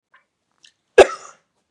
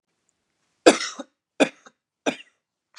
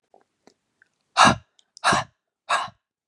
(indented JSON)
{
  "cough_length": "1.7 s",
  "cough_amplitude": 32768,
  "cough_signal_mean_std_ratio": 0.18,
  "three_cough_length": "3.0 s",
  "three_cough_amplitude": 32209,
  "three_cough_signal_mean_std_ratio": 0.21,
  "exhalation_length": "3.1 s",
  "exhalation_amplitude": 29526,
  "exhalation_signal_mean_std_ratio": 0.3,
  "survey_phase": "beta (2021-08-13 to 2022-03-07)",
  "age": "18-44",
  "gender": "Female",
  "wearing_mask": "No",
  "symptom_none": true,
  "smoker_status": "Never smoked",
  "respiratory_condition_asthma": false,
  "respiratory_condition_other": false,
  "recruitment_source": "REACT",
  "submission_delay": "2 days",
  "covid_test_result": "Negative",
  "covid_test_method": "RT-qPCR"
}